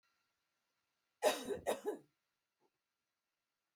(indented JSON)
{
  "cough_length": "3.8 s",
  "cough_amplitude": 3307,
  "cough_signal_mean_std_ratio": 0.28,
  "survey_phase": "alpha (2021-03-01 to 2021-08-12)",
  "age": "45-64",
  "gender": "Female",
  "wearing_mask": "No",
  "symptom_none": true,
  "smoker_status": "Never smoked",
  "respiratory_condition_asthma": false,
  "respiratory_condition_other": false,
  "recruitment_source": "REACT",
  "submission_delay": "2 days",
  "covid_test_result": "Negative",
  "covid_test_method": "RT-qPCR"
}